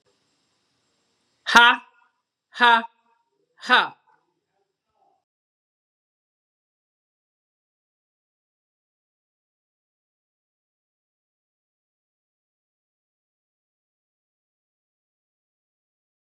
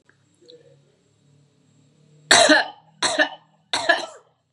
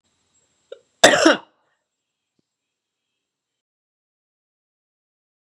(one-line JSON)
{"exhalation_length": "16.4 s", "exhalation_amplitude": 32768, "exhalation_signal_mean_std_ratio": 0.14, "three_cough_length": "4.5 s", "three_cough_amplitude": 32768, "three_cough_signal_mean_std_ratio": 0.33, "cough_length": "5.5 s", "cough_amplitude": 32768, "cough_signal_mean_std_ratio": 0.18, "survey_phase": "beta (2021-08-13 to 2022-03-07)", "age": "45-64", "gender": "Female", "wearing_mask": "No", "symptom_runny_or_blocked_nose": true, "symptom_fatigue": true, "symptom_onset": "5 days", "smoker_status": "Never smoked", "respiratory_condition_asthma": false, "respiratory_condition_other": false, "recruitment_source": "REACT", "submission_delay": "5 days", "covid_test_result": "Negative", "covid_test_method": "RT-qPCR", "influenza_a_test_result": "Negative", "influenza_b_test_result": "Negative"}